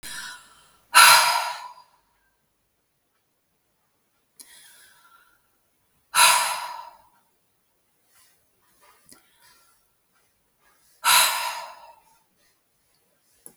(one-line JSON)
{"exhalation_length": "13.6 s", "exhalation_amplitude": 32768, "exhalation_signal_mean_std_ratio": 0.26, "survey_phase": "beta (2021-08-13 to 2022-03-07)", "age": "18-44", "gender": "Female", "wearing_mask": "No", "symptom_none": true, "smoker_status": "Never smoked", "respiratory_condition_asthma": true, "respiratory_condition_other": false, "recruitment_source": "REACT", "submission_delay": "1 day", "covid_test_result": "Negative", "covid_test_method": "RT-qPCR"}